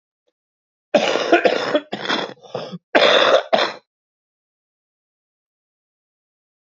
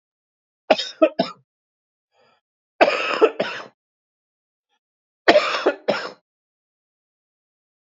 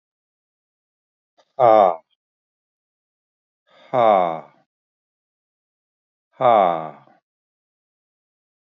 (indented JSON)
{
  "cough_length": "6.7 s",
  "cough_amplitude": 30942,
  "cough_signal_mean_std_ratio": 0.4,
  "three_cough_length": "7.9 s",
  "three_cough_amplitude": 32768,
  "three_cough_signal_mean_std_ratio": 0.3,
  "exhalation_length": "8.6 s",
  "exhalation_amplitude": 26579,
  "exhalation_signal_mean_std_ratio": 0.26,
  "survey_phase": "beta (2021-08-13 to 2022-03-07)",
  "age": "65+",
  "gender": "Male",
  "wearing_mask": "No",
  "symptom_cough_any": true,
  "symptom_onset": "9 days",
  "smoker_status": "Never smoked",
  "respiratory_condition_asthma": false,
  "respiratory_condition_other": false,
  "recruitment_source": "Test and Trace",
  "submission_delay": "1 day",
  "covid_test_result": "Positive",
  "covid_test_method": "RT-qPCR",
  "covid_ct_value": 19.9,
  "covid_ct_gene": "ORF1ab gene",
  "covid_ct_mean": 20.3,
  "covid_viral_load": "220000 copies/ml",
  "covid_viral_load_category": "Low viral load (10K-1M copies/ml)"
}